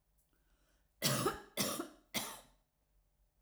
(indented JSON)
{
  "three_cough_length": "3.4 s",
  "three_cough_amplitude": 4399,
  "three_cough_signal_mean_std_ratio": 0.4,
  "survey_phase": "alpha (2021-03-01 to 2021-08-12)",
  "age": "45-64",
  "gender": "Female",
  "wearing_mask": "No",
  "symptom_none": true,
  "symptom_onset": "9 days",
  "smoker_status": "Ex-smoker",
  "respiratory_condition_asthma": false,
  "respiratory_condition_other": false,
  "recruitment_source": "REACT",
  "submission_delay": "2 days",
  "covid_test_result": "Negative",
  "covid_test_method": "RT-qPCR"
}